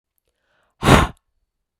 {
  "exhalation_length": "1.8 s",
  "exhalation_amplitude": 32768,
  "exhalation_signal_mean_std_ratio": 0.27,
  "survey_phase": "beta (2021-08-13 to 2022-03-07)",
  "age": "45-64",
  "gender": "Female",
  "wearing_mask": "No",
  "symptom_cough_any": true,
  "symptom_runny_or_blocked_nose": true,
  "symptom_sore_throat": true,
  "symptom_change_to_sense_of_smell_or_taste": true,
  "symptom_loss_of_taste": true,
  "symptom_onset": "6 days",
  "smoker_status": "Never smoked",
  "respiratory_condition_asthma": false,
  "respiratory_condition_other": false,
  "recruitment_source": "Test and Trace",
  "submission_delay": "2 days",
  "covid_test_result": "Positive",
  "covid_test_method": "RT-qPCR"
}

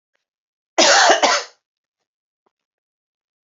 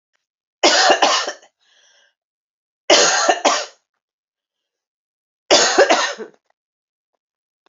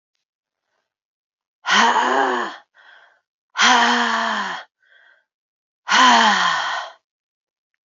{
  "cough_length": "3.5 s",
  "cough_amplitude": 30957,
  "cough_signal_mean_std_ratio": 0.34,
  "three_cough_length": "7.7 s",
  "three_cough_amplitude": 32767,
  "three_cough_signal_mean_std_ratio": 0.4,
  "exhalation_length": "7.9 s",
  "exhalation_amplitude": 27777,
  "exhalation_signal_mean_std_ratio": 0.49,
  "survey_phase": "beta (2021-08-13 to 2022-03-07)",
  "age": "45-64",
  "gender": "Female",
  "wearing_mask": "No",
  "symptom_cough_any": true,
  "symptom_new_continuous_cough": true,
  "symptom_runny_or_blocked_nose": true,
  "symptom_shortness_of_breath": true,
  "symptom_sore_throat": true,
  "symptom_fatigue": true,
  "symptom_headache": true,
  "symptom_onset": "4 days",
  "smoker_status": "Never smoked",
  "respiratory_condition_asthma": false,
  "respiratory_condition_other": false,
  "recruitment_source": "Test and Trace",
  "submission_delay": "2 days",
  "covid_test_result": "Positive",
  "covid_test_method": "RT-qPCR"
}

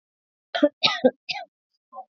{
  "three_cough_length": "2.1 s",
  "three_cough_amplitude": 22787,
  "three_cough_signal_mean_std_ratio": 0.31,
  "survey_phase": "beta (2021-08-13 to 2022-03-07)",
  "age": "18-44",
  "gender": "Female",
  "wearing_mask": "Yes",
  "symptom_runny_or_blocked_nose": true,
  "symptom_sore_throat": true,
  "symptom_onset": "4 days",
  "smoker_status": "Never smoked",
  "respiratory_condition_asthma": false,
  "respiratory_condition_other": false,
  "recruitment_source": "REACT",
  "submission_delay": "1 day",
  "covid_test_result": "Negative",
  "covid_test_method": "RT-qPCR",
  "influenza_a_test_result": "Negative",
  "influenza_b_test_result": "Negative"
}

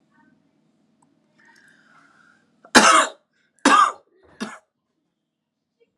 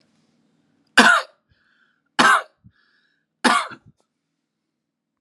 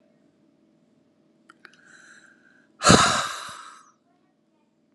{
  "cough_length": "6.0 s",
  "cough_amplitude": 32768,
  "cough_signal_mean_std_ratio": 0.26,
  "three_cough_length": "5.2 s",
  "three_cough_amplitude": 32767,
  "three_cough_signal_mean_std_ratio": 0.28,
  "exhalation_length": "4.9 s",
  "exhalation_amplitude": 31714,
  "exhalation_signal_mean_std_ratio": 0.25,
  "survey_phase": "alpha (2021-03-01 to 2021-08-12)",
  "age": "18-44",
  "gender": "Male",
  "wearing_mask": "No",
  "symptom_none": true,
  "smoker_status": "Ex-smoker",
  "respiratory_condition_asthma": false,
  "respiratory_condition_other": false,
  "recruitment_source": "Test and Trace",
  "submission_delay": "2 days",
  "covid_test_result": "Positive",
  "covid_test_method": "RT-qPCR",
  "covid_ct_value": 26.8,
  "covid_ct_gene": "ORF1ab gene",
  "covid_ct_mean": 27.2,
  "covid_viral_load": "1200 copies/ml",
  "covid_viral_load_category": "Minimal viral load (< 10K copies/ml)"
}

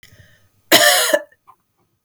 {
  "cough_length": "2.0 s",
  "cough_amplitude": 32768,
  "cough_signal_mean_std_ratio": 0.39,
  "survey_phase": "beta (2021-08-13 to 2022-03-07)",
  "age": "18-44",
  "gender": "Female",
  "wearing_mask": "No",
  "symptom_cough_any": true,
  "symptom_runny_or_blocked_nose": true,
  "symptom_sore_throat": true,
  "symptom_abdominal_pain": true,
  "symptom_fatigue": true,
  "symptom_headache": true,
  "symptom_change_to_sense_of_smell_or_taste": true,
  "symptom_loss_of_taste": true,
  "symptom_onset": "5 days",
  "smoker_status": "Never smoked",
  "respiratory_condition_asthma": false,
  "respiratory_condition_other": false,
  "recruitment_source": "Test and Trace",
  "submission_delay": "2 days",
  "covid_test_result": "Positive",
  "covid_test_method": "RT-qPCR",
  "covid_ct_value": 14.2,
  "covid_ct_gene": "ORF1ab gene"
}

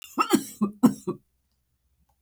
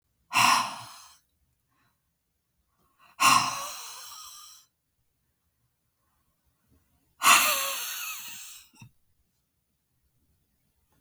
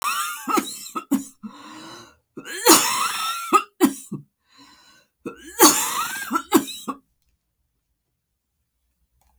{
  "cough_length": "2.2 s",
  "cough_amplitude": 17344,
  "cough_signal_mean_std_ratio": 0.34,
  "exhalation_length": "11.0 s",
  "exhalation_amplitude": 19365,
  "exhalation_signal_mean_std_ratio": 0.3,
  "three_cough_length": "9.4 s",
  "three_cough_amplitude": 32768,
  "three_cough_signal_mean_std_ratio": 0.4,
  "survey_phase": "beta (2021-08-13 to 2022-03-07)",
  "age": "65+",
  "gender": "Female",
  "wearing_mask": "No",
  "symptom_sore_throat": true,
  "symptom_other": true,
  "smoker_status": "Never smoked",
  "respiratory_condition_asthma": false,
  "respiratory_condition_other": false,
  "recruitment_source": "Test and Trace",
  "submission_delay": "1 day",
  "covid_test_result": "Negative",
  "covid_test_method": "RT-qPCR"
}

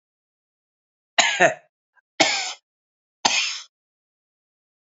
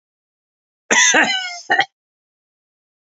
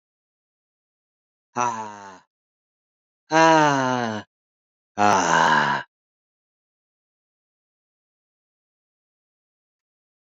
{
  "three_cough_length": "4.9 s",
  "three_cough_amplitude": 30165,
  "three_cough_signal_mean_std_ratio": 0.31,
  "cough_length": "3.2 s",
  "cough_amplitude": 31812,
  "cough_signal_mean_std_ratio": 0.37,
  "exhalation_length": "10.3 s",
  "exhalation_amplitude": 28259,
  "exhalation_signal_mean_std_ratio": 0.31,
  "survey_phase": "beta (2021-08-13 to 2022-03-07)",
  "age": "45-64",
  "gender": "Male",
  "wearing_mask": "No",
  "symptom_none": true,
  "smoker_status": "Never smoked",
  "respiratory_condition_asthma": false,
  "respiratory_condition_other": false,
  "recruitment_source": "REACT",
  "submission_delay": "1 day",
  "covid_test_result": "Negative",
  "covid_test_method": "RT-qPCR",
  "influenza_a_test_result": "Negative",
  "influenza_b_test_result": "Negative"
}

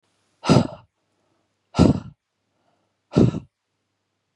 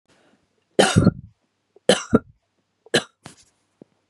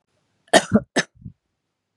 {
  "exhalation_length": "4.4 s",
  "exhalation_amplitude": 31440,
  "exhalation_signal_mean_std_ratio": 0.28,
  "three_cough_length": "4.1 s",
  "three_cough_amplitude": 31075,
  "three_cough_signal_mean_std_ratio": 0.27,
  "cough_length": "2.0 s",
  "cough_amplitude": 32767,
  "cough_signal_mean_std_ratio": 0.25,
  "survey_phase": "beta (2021-08-13 to 2022-03-07)",
  "age": "45-64",
  "gender": "Female",
  "wearing_mask": "No",
  "symptom_none": true,
  "smoker_status": "Never smoked",
  "respiratory_condition_asthma": false,
  "respiratory_condition_other": false,
  "recruitment_source": "REACT",
  "submission_delay": "3 days",
  "covid_test_result": "Negative",
  "covid_test_method": "RT-qPCR",
  "influenza_a_test_result": "Negative",
  "influenza_b_test_result": "Negative"
}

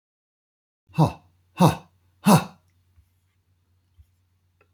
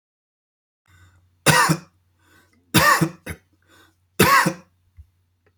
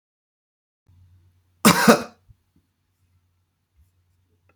{
  "exhalation_length": "4.7 s",
  "exhalation_amplitude": 22463,
  "exhalation_signal_mean_std_ratio": 0.24,
  "three_cough_length": "5.6 s",
  "three_cough_amplitude": 32733,
  "three_cough_signal_mean_std_ratio": 0.34,
  "cough_length": "4.6 s",
  "cough_amplitude": 32768,
  "cough_signal_mean_std_ratio": 0.2,
  "survey_phase": "beta (2021-08-13 to 2022-03-07)",
  "age": "65+",
  "gender": "Male",
  "wearing_mask": "No",
  "symptom_none": true,
  "smoker_status": "Never smoked",
  "respiratory_condition_asthma": false,
  "respiratory_condition_other": false,
  "recruitment_source": "REACT",
  "submission_delay": "1 day",
  "covid_test_result": "Negative",
  "covid_test_method": "RT-qPCR"
}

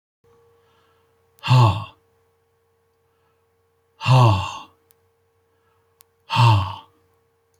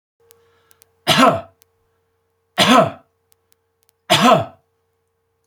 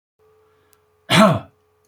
{
  "exhalation_length": "7.6 s",
  "exhalation_amplitude": 23425,
  "exhalation_signal_mean_std_ratio": 0.32,
  "three_cough_length": "5.5 s",
  "three_cough_amplitude": 30002,
  "three_cough_signal_mean_std_ratio": 0.34,
  "cough_length": "1.9 s",
  "cough_amplitude": 28894,
  "cough_signal_mean_std_ratio": 0.31,
  "survey_phase": "beta (2021-08-13 to 2022-03-07)",
  "age": "65+",
  "gender": "Male",
  "wearing_mask": "No",
  "symptom_none": true,
  "smoker_status": "Ex-smoker",
  "respiratory_condition_asthma": false,
  "respiratory_condition_other": false,
  "recruitment_source": "REACT",
  "submission_delay": "1 day",
  "covid_test_result": "Negative",
  "covid_test_method": "RT-qPCR"
}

